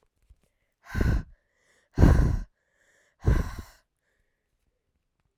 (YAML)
exhalation_length: 5.4 s
exhalation_amplitude: 21616
exhalation_signal_mean_std_ratio: 0.32
survey_phase: alpha (2021-03-01 to 2021-08-12)
age: 18-44
gender: Female
wearing_mask: 'No'
symptom_cough_any: true
symptom_headache: true
smoker_status: Never smoked
respiratory_condition_asthma: false
respiratory_condition_other: false
recruitment_source: Test and Trace
submission_delay: 2 days
covid_test_result: Positive
covid_test_method: RT-qPCR
covid_ct_value: 24.6
covid_ct_gene: N gene